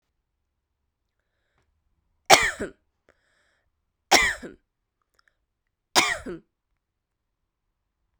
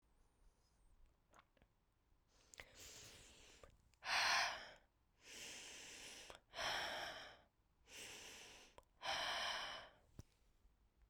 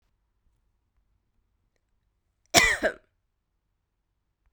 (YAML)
three_cough_length: 8.2 s
three_cough_amplitude: 32768
three_cough_signal_mean_std_ratio: 0.21
exhalation_length: 11.1 s
exhalation_amplitude: 1408
exhalation_signal_mean_std_ratio: 0.45
cough_length: 4.5 s
cough_amplitude: 25394
cough_signal_mean_std_ratio: 0.2
survey_phase: beta (2021-08-13 to 2022-03-07)
age: 45-64
gender: Female
wearing_mask: 'No'
symptom_runny_or_blocked_nose: true
symptom_fatigue: true
symptom_headache: true
symptom_onset: 3 days
smoker_status: Never smoked
respiratory_condition_asthma: true
respiratory_condition_other: false
recruitment_source: Test and Trace
submission_delay: 2 days
covid_test_result: Positive
covid_test_method: RT-qPCR